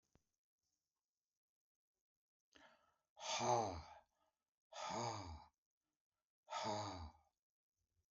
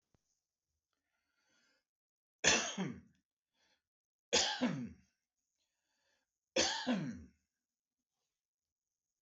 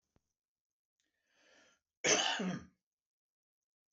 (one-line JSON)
{"exhalation_length": "8.1 s", "exhalation_amplitude": 1850, "exhalation_signal_mean_std_ratio": 0.36, "three_cough_length": "9.2 s", "three_cough_amplitude": 5750, "three_cough_signal_mean_std_ratio": 0.31, "cough_length": "3.9 s", "cough_amplitude": 5808, "cough_signal_mean_std_ratio": 0.29, "survey_phase": "beta (2021-08-13 to 2022-03-07)", "age": "65+", "gender": "Male", "wearing_mask": "No", "symptom_none": true, "smoker_status": "Current smoker (11 or more cigarettes per day)", "respiratory_condition_asthma": false, "respiratory_condition_other": false, "recruitment_source": "REACT", "submission_delay": "2 days", "covid_test_result": "Negative", "covid_test_method": "RT-qPCR"}